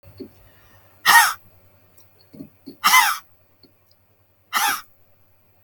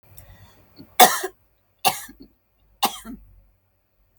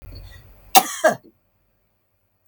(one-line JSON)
{"exhalation_length": "5.6 s", "exhalation_amplitude": 32766, "exhalation_signal_mean_std_ratio": 0.31, "three_cough_length": "4.2 s", "three_cough_amplitude": 32768, "three_cough_signal_mean_std_ratio": 0.23, "cough_length": "2.5 s", "cough_amplitude": 32768, "cough_signal_mean_std_ratio": 0.25, "survey_phase": "beta (2021-08-13 to 2022-03-07)", "age": "45-64", "gender": "Female", "wearing_mask": "No", "symptom_none": true, "smoker_status": "Never smoked", "respiratory_condition_asthma": false, "respiratory_condition_other": false, "recruitment_source": "REACT", "submission_delay": "2 days", "covid_test_result": "Negative", "covid_test_method": "RT-qPCR", "influenza_a_test_result": "Negative", "influenza_b_test_result": "Negative"}